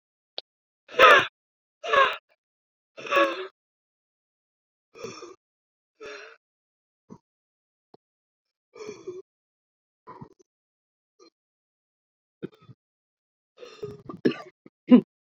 {"exhalation_length": "15.3 s", "exhalation_amplitude": 24992, "exhalation_signal_mean_std_ratio": 0.21, "survey_phase": "beta (2021-08-13 to 2022-03-07)", "age": "18-44", "gender": "Female", "wearing_mask": "No", "symptom_shortness_of_breath": true, "symptom_abdominal_pain": true, "symptom_headache": true, "symptom_onset": "12 days", "smoker_status": "Ex-smoker", "respiratory_condition_asthma": true, "respiratory_condition_other": false, "recruitment_source": "REACT", "submission_delay": "6 days", "covid_test_result": "Negative", "covid_test_method": "RT-qPCR"}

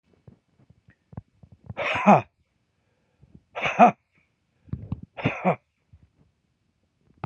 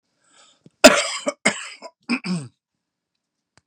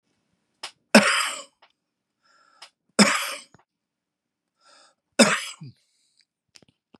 {"exhalation_length": "7.3 s", "exhalation_amplitude": 26635, "exhalation_signal_mean_std_ratio": 0.25, "cough_length": "3.7 s", "cough_amplitude": 32768, "cough_signal_mean_std_ratio": 0.27, "three_cough_length": "7.0 s", "three_cough_amplitude": 32767, "three_cough_signal_mean_std_ratio": 0.25, "survey_phase": "beta (2021-08-13 to 2022-03-07)", "age": "65+", "gender": "Male", "wearing_mask": "No", "symptom_cough_any": true, "symptom_runny_or_blocked_nose": true, "smoker_status": "Never smoked", "respiratory_condition_asthma": false, "respiratory_condition_other": false, "recruitment_source": "Test and Trace", "submission_delay": "1 day", "covid_test_result": "Positive", "covid_test_method": "RT-qPCR", "covid_ct_value": 22.4, "covid_ct_gene": "N gene", "covid_ct_mean": 22.8, "covid_viral_load": "33000 copies/ml", "covid_viral_load_category": "Low viral load (10K-1M copies/ml)"}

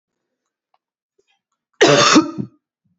{"cough_length": "3.0 s", "cough_amplitude": 29266, "cough_signal_mean_std_ratio": 0.33, "survey_phase": "beta (2021-08-13 to 2022-03-07)", "age": "18-44", "gender": "Male", "wearing_mask": "No", "symptom_cough_any": true, "symptom_runny_or_blocked_nose": true, "symptom_change_to_sense_of_smell_or_taste": true, "symptom_loss_of_taste": true, "symptom_onset": "7 days", "smoker_status": "Never smoked", "respiratory_condition_asthma": false, "respiratory_condition_other": false, "recruitment_source": "REACT", "submission_delay": "0 days", "covid_test_result": "Positive", "covid_test_method": "RT-qPCR", "covid_ct_value": 29.0, "covid_ct_gene": "E gene"}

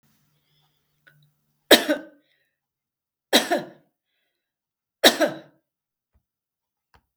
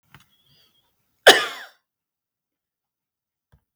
{"three_cough_length": "7.2 s", "three_cough_amplitude": 32768, "three_cough_signal_mean_std_ratio": 0.21, "cough_length": "3.8 s", "cough_amplitude": 32768, "cough_signal_mean_std_ratio": 0.16, "survey_phase": "beta (2021-08-13 to 2022-03-07)", "age": "65+", "gender": "Female", "wearing_mask": "No", "symptom_none": true, "smoker_status": "Never smoked", "respiratory_condition_asthma": false, "respiratory_condition_other": false, "recruitment_source": "Test and Trace", "submission_delay": "1 day", "covid_test_result": "Negative", "covid_test_method": "RT-qPCR"}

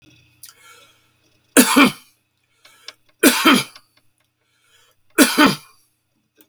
{"three_cough_length": "6.5 s", "three_cough_amplitude": 32768, "three_cough_signal_mean_std_ratio": 0.32, "survey_phase": "beta (2021-08-13 to 2022-03-07)", "age": "65+", "gender": "Male", "wearing_mask": "No", "symptom_cough_any": true, "smoker_status": "Ex-smoker", "respiratory_condition_asthma": true, "respiratory_condition_other": false, "recruitment_source": "REACT", "submission_delay": "1 day", "covid_test_result": "Negative", "covid_test_method": "RT-qPCR"}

